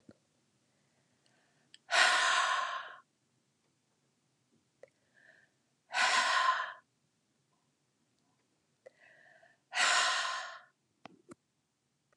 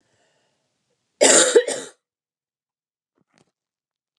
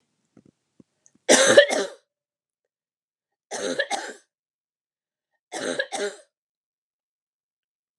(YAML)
exhalation_length: 12.2 s
exhalation_amplitude: 8302
exhalation_signal_mean_std_ratio: 0.36
cough_length: 4.2 s
cough_amplitude: 32414
cough_signal_mean_std_ratio: 0.26
three_cough_length: 8.0 s
three_cough_amplitude: 31665
three_cough_signal_mean_std_ratio: 0.26
survey_phase: alpha (2021-03-01 to 2021-08-12)
age: 18-44
gender: Female
wearing_mask: 'No'
symptom_none: true
smoker_status: Never smoked
respiratory_condition_asthma: true
respiratory_condition_other: false
recruitment_source: REACT
submission_delay: 1 day
covid_test_result: Negative
covid_test_method: RT-qPCR